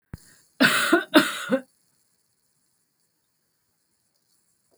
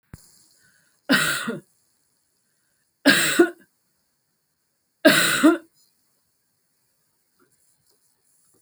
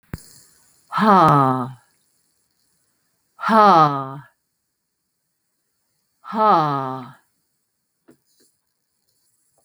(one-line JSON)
{"cough_length": "4.8 s", "cough_amplitude": 24631, "cough_signal_mean_std_ratio": 0.3, "three_cough_length": "8.6 s", "three_cough_amplitude": 28198, "three_cough_signal_mean_std_ratio": 0.3, "exhalation_length": "9.6 s", "exhalation_amplitude": 30882, "exhalation_signal_mean_std_ratio": 0.34, "survey_phase": "beta (2021-08-13 to 2022-03-07)", "age": "65+", "gender": "Female", "wearing_mask": "No", "symptom_sore_throat": true, "symptom_onset": "12 days", "smoker_status": "Never smoked", "respiratory_condition_asthma": false, "respiratory_condition_other": false, "recruitment_source": "REACT", "submission_delay": "2 days", "covid_test_result": "Negative", "covid_test_method": "RT-qPCR"}